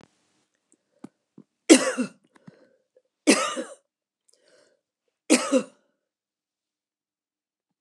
{
  "three_cough_length": "7.8 s",
  "three_cough_amplitude": 28388,
  "three_cough_signal_mean_std_ratio": 0.23,
  "survey_phase": "alpha (2021-03-01 to 2021-08-12)",
  "age": "65+",
  "gender": "Female",
  "wearing_mask": "No",
  "symptom_none": true,
  "smoker_status": "Never smoked",
  "respiratory_condition_asthma": true,
  "respiratory_condition_other": false,
  "recruitment_source": "REACT",
  "submission_delay": "1 day",
  "covid_test_result": "Negative",
  "covid_test_method": "RT-qPCR"
}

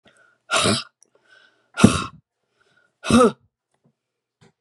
{
  "exhalation_length": "4.6 s",
  "exhalation_amplitude": 32768,
  "exhalation_signal_mean_std_ratio": 0.3,
  "survey_phase": "beta (2021-08-13 to 2022-03-07)",
  "age": "65+",
  "gender": "Female",
  "wearing_mask": "No",
  "symptom_cough_any": true,
  "symptom_runny_or_blocked_nose": true,
  "symptom_fatigue": true,
  "smoker_status": "Never smoked",
  "respiratory_condition_asthma": false,
  "respiratory_condition_other": true,
  "recruitment_source": "Test and Trace",
  "submission_delay": "2 days",
  "covid_test_result": "Positive",
  "covid_test_method": "RT-qPCR"
}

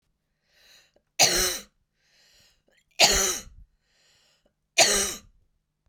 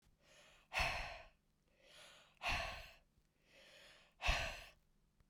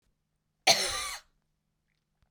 {
  "three_cough_length": "5.9 s",
  "three_cough_amplitude": 22590,
  "three_cough_signal_mean_std_ratio": 0.33,
  "exhalation_length": "5.3 s",
  "exhalation_amplitude": 2347,
  "exhalation_signal_mean_std_ratio": 0.41,
  "cough_length": "2.3 s",
  "cough_amplitude": 15206,
  "cough_signal_mean_std_ratio": 0.29,
  "survey_phase": "beta (2021-08-13 to 2022-03-07)",
  "age": "45-64",
  "gender": "Female",
  "wearing_mask": "No",
  "symptom_cough_any": true,
  "symptom_headache": true,
  "symptom_other": true,
  "symptom_onset": "4 days",
  "smoker_status": "Ex-smoker",
  "respiratory_condition_asthma": false,
  "respiratory_condition_other": false,
  "recruitment_source": "Test and Trace",
  "submission_delay": "2 days",
  "covid_test_result": "Positive",
  "covid_test_method": "RT-qPCR",
  "covid_ct_value": 31.0,
  "covid_ct_gene": "ORF1ab gene"
}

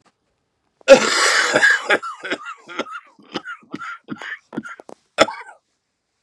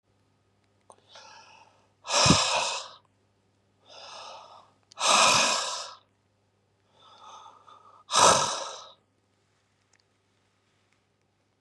{
  "cough_length": "6.2 s",
  "cough_amplitude": 32768,
  "cough_signal_mean_std_ratio": 0.38,
  "exhalation_length": "11.6 s",
  "exhalation_amplitude": 17481,
  "exhalation_signal_mean_std_ratio": 0.34,
  "survey_phase": "beta (2021-08-13 to 2022-03-07)",
  "age": "45-64",
  "gender": "Male",
  "wearing_mask": "No",
  "symptom_new_continuous_cough": true,
  "symptom_runny_or_blocked_nose": true,
  "symptom_sore_throat": true,
  "symptom_fatigue": true,
  "symptom_headache": true,
  "smoker_status": "Never smoked",
  "respiratory_condition_asthma": false,
  "respiratory_condition_other": false,
  "recruitment_source": "Test and Trace",
  "submission_delay": "2 days",
  "covid_test_result": "Positive",
  "covid_test_method": "RT-qPCR"
}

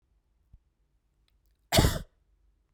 {
  "cough_length": "2.7 s",
  "cough_amplitude": 12950,
  "cough_signal_mean_std_ratio": 0.24,
  "survey_phase": "beta (2021-08-13 to 2022-03-07)",
  "age": "18-44",
  "gender": "Female",
  "wearing_mask": "No",
  "symptom_runny_or_blocked_nose": true,
  "smoker_status": "Never smoked",
  "respiratory_condition_asthma": false,
  "respiratory_condition_other": false,
  "recruitment_source": "Test and Trace",
  "submission_delay": "1 day",
  "covid_test_result": "Positive",
  "covid_test_method": "RT-qPCR",
  "covid_ct_value": 18.0,
  "covid_ct_gene": "ORF1ab gene",
  "covid_ct_mean": 18.5,
  "covid_viral_load": "830000 copies/ml",
  "covid_viral_load_category": "Low viral load (10K-1M copies/ml)"
}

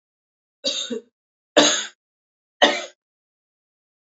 {
  "three_cough_length": "4.0 s",
  "three_cough_amplitude": 29461,
  "three_cough_signal_mean_std_ratio": 0.3,
  "survey_phase": "beta (2021-08-13 to 2022-03-07)",
  "age": "18-44",
  "gender": "Female",
  "wearing_mask": "No",
  "symptom_cough_any": true,
  "symptom_runny_or_blocked_nose": true,
  "symptom_fatigue": true,
  "symptom_headache": true,
  "symptom_onset": "3 days",
  "smoker_status": "Ex-smoker",
  "respiratory_condition_asthma": false,
  "respiratory_condition_other": false,
  "recruitment_source": "Test and Trace",
  "submission_delay": "2 days",
  "covid_test_result": "Positive",
  "covid_test_method": "RT-qPCR",
  "covid_ct_value": 19.9,
  "covid_ct_gene": "ORF1ab gene",
  "covid_ct_mean": 20.7,
  "covid_viral_load": "160000 copies/ml",
  "covid_viral_load_category": "Low viral load (10K-1M copies/ml)"
}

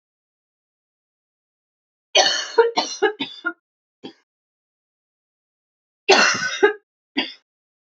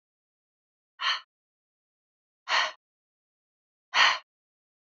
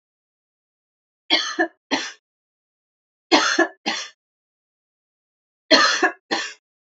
{
  "cough_length": "7.9 s",
  "cough_amplitude": 29412,
  "cough_signal_mean_std_ratio": 0.32,
  "exhalation_length": "4.9 s",
  "exhalation_amplitude": 13659,
  "exhalation_signal_mean_std_ratio": 0.26,
  "three_cough_length": "7.0 s",
  "three_cough_amplitude": 29812,
  "three_cough_signal_mean_std_ratio": 0.34,
  "survey_phase": "alpha (2021-03-01 to 2021-08-12)",
  "age": "18-44",
  "gender": "Female",
  "wearing_mask": "No",
  "symptom_cough_any": true,
  "symptom_new_continuous_cough": true,
  "symptom_fatigue": true,
  "symptom_headache": true,
  "smoker_status": "Never smoked",
  "respiratory_condition_asthma": true,
  "respiratory_condition_other": false,
  "recruitment_source": "Test and Trace",
  "submission_delay": "1 day",
  "covid_test_result": "Positive",
  "covid_test_method": "RT-qPCR"
}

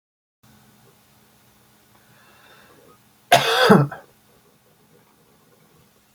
{
  "cough_length": "6.1 s",
  "cough_amplitude": 30056,
  "cough_signal_mean_std_ratio": 0.24,
  "survey_phase": "beta (2021-08-13 to 2022-03-07)",
  "age": "45-64",
  "gender": "Male",
  "wearing_mask": "No",
  "symptom_none": true,
  "smoker_status": "Ex-smoker",
  "respiratory_condition_asthma": true,
  "respiratory_condition_other": false,
  "recruitment_source": "REACT",
  "submission_delay": "4 days",
  "covid_test_result": "Negative",
  "covid_test_method": "RT-qPCR"
}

